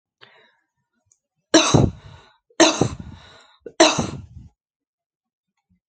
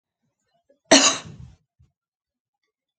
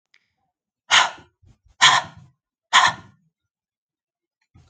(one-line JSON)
{"three_cough_length": "5.9 s", "three_cough_amplitude": 29724, "three_cough_signal_mean_std_ratio": 0.3, "cough_length": "3.0 s", "cough_amplitude": 31858, "cough_signal_mean_std_ratio": 0.22, "exhalation_length": "4.7 s", "exhalation_amplitude": 32704, "exhalation_signal_mean_std_ratio": 0.28, "survey_phase": "alpha (2021-03-01 to 2021-08-12)", "age": "45-64", "gender": "Female", "wearing_mask": "No", "symptom_none": true, "smoker_status": "Ex-smoker", "respiratory_condition_asthma": false, "respiratory_condition_other": false, "recruitment_source": "REACT", "submission_delay": "2 days", "covid_test_result": "Negative", "covid_test_method": "RT-qPCR"}